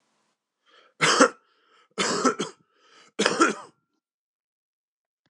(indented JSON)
{
  "three_cough_length": "5.3 s",
  "three_cough_amplitude": 25814,
  "three_cough_signal_mean_std_ratio": 0.33,
  "survey_phase": "beta (2021-08-13 to 2022-03-07)",
  "age": "45-64",
  "gender": "Male",
  "wearing_mask": "No",
  "symptom_cough_any": true,
  "symptom_runny_or_blocked_nose": true,
  "symptom_fatigue": true,
  "symptom_headache": true,
  "symptom_other": true,
  "symptom_onset": "2 days",
  "smoker_status": "Never smoked",
  "respiratory_condition_asthma": false,
  "respiratory_condition_other": false,
  "recruitment_source": "Test and Trace",
  "submission_delay": "1 day",
  "covid_test_result": "Positive",
  "covid_test_method": "ePCR"
}